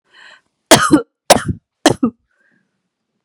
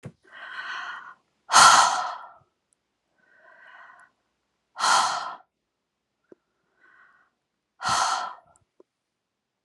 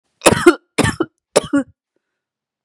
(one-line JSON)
{"cough_length": "3.2 s", "cough_amplitude": 32768, "cough_signal_mean_std_ratio": 0.31, "exhalation_length": "9.6 s", "exhalation_amplitude": 27814, "exhalation_signal_mean_std_ratio": 0.3, "three_cough_length": "2.6 s", "three_cough_amplitude": 32768, "three_cough_signal_mean_std_ratio": 0.34, "survey_phase": "beta (2021-08-13 to 2022-03-07)", "age": "45-64", "gender": "Female", "wearing_mask": "No", "symptom_cough_any": true, "symptom_new_continuous_cough": true, "symptom_runny_or_blocked_nose": true, "symptom_sore_throat": true, "symptom_fatigue": true, "symptom_fever_high_temperature": true, "symptom_headache": true, "symptom_other": true, "symptom_onset": "3 days", "smoker_status": "Never smoked", "respiratory_condition_asthma": false, "respiratory_condition_other": false, "recruitment_source": "Test and Trace", "submission_delay": "2 days", "covid_test_result": "Positive", "covid_test_method": "RT-qPCR", "covid_ct_value": 21.8, "covid_ct_gene": "ORF1ab gene", "covid_ct_mean": 22.1, "covid_viral_load": "57000 copies/ml", "covid_viral_load_category": "Low viral load (10K-1M copies/ml)"}